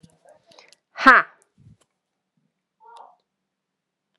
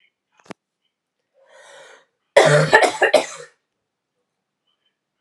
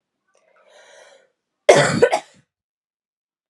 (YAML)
exhalation_length: 4.2 s
exhalation_amplitude: 32768
exhalation_signal_mean_std_ratio: 0.16
three_cough_length: 5.2 s
three_cough_amplitude: 32768
three_cough_signal_mean_std_ratio: 0.3
cough_length: 3.5 s
cough_amplitude: 32768
cough_signal_mean_std_ratio: 0.27
survey_phase: alpha (2021-03-01 to 2021-08-12)
age: 18-44
gender: Female
wearing_mask: 'No'
symptom_new_continuous_cough: true
symptom_fatigue: true
symptom_headache: true
symptom_change_to_sense_of_smell_or_taste: true
symptom_onset: 5 days
smoker_status: Never smoked
respiratory_condition_asthma: false
respiratory_condition_other: false
recruitment_source: Test and Trace
submission_delay: 1 day
covid_test_result: Positive
covid_test_method: RT-qPCR
covid_ct_value: 12.9
covid_ct_gene: ORF1ab gene
covid_ct_mean: 13.8
covid_viral_load: 30000000 copies/ml
covid_viral_load_category: High viral load (>1M copies/ml)